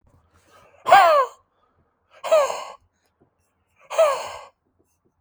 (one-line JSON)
{"exhalation_length": "5.2 s", "exhalation_amplitude": 32768, "exhalation_signal_mean_std_ratio": 0.35, "survey_phase": "beta (2021-08-13 to 2022-03-07)", "age": "18-44", "gender": "Male", "wearing_mask": "No", "symptom_cough_any": true, "symptom_runny_or_blocked_nose": true, "symptom_fatigue": true, "symptom_onset": "2 days", "smoker_status": "Never smoked", "respiratory_condition_asthma": false, "respiratory_condition_other": false, "recruitment_source": "REACT", "submission_delay": "1 day", "covid_test_result": "Negative", "covid_test_method": "RT-qPCR"}